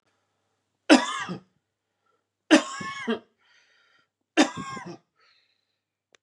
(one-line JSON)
{"three_cough_length": "6.2 s", "three_cough_amplitude": 24680, "three_cough_signal_mean_std_ratio": 0.26, "survey_phase": "beta (2021-08-13 to 2022-03-07)", "age": "45-64", "gender": "Male", "wearing_mask": "No", "symptom_none": true, "smoker_status": "Ex-smoker", "respiratory_condition_asthma": false, "respiratory_condition_other": false, "recruitment_source": "REACT", "submission_delay": "1 day", "covid_test_result": "Negative", "covid_test_method": "RT-qPCR", "influenza_a_test_result": "Negative", "influenza_b_test_result": "Negative"}